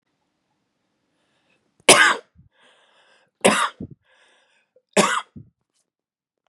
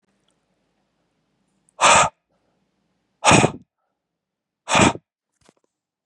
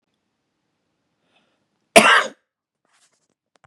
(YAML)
three_cough_length: 6.5 s
three_cough_amplitude: 32768
three_cough_signal_mean_std_ratio: 0.25
exhalation_length: 6.1 s
exhalation_amplitude: 30072
exhalation_signal_mean_std_ratio: 0.28
cough_length: 3.7 s
cough_amplitude: 32768
cough_signal_mean_std_ratio: 0.21
survey_phase: beta (2021-08-13 to 2022-03-07)
age: 18-44
gender: Male
wearing_mask: 'No'
symptom_none: true
smoker_status: Never smoked
respiratory_condition_asthma: false
respiratory_condition_other: false
recruitment_source: REACT
submission_delay: 0 days
covid_test_result: Negative
covid_test_method: RT-qPCR
influenza_a_test_result: Negative
influenza_b_test_result: Negative